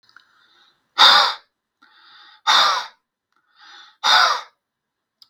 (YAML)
exhalation_length: 5.3 s
exhalation_amplitude: 32768
exhalation_signal_mean_std_ratio: 0.36
survey_phase: beta (2021-08-13 to 2022-03-07)
age: 45-64
gender: Male
wearing_mask: 'No'
symptom_none: true
smoker_status: Ex-smoker
respiratory_condition_asthma: false
respiratory_condition_other: false
recruitment_source: REACT
submission_delay: 6 days
covid_test_result: Negative
covid_test_method: RT-qPCR
influenza_a_test_result: Negative
influenza_b_test_result: Negative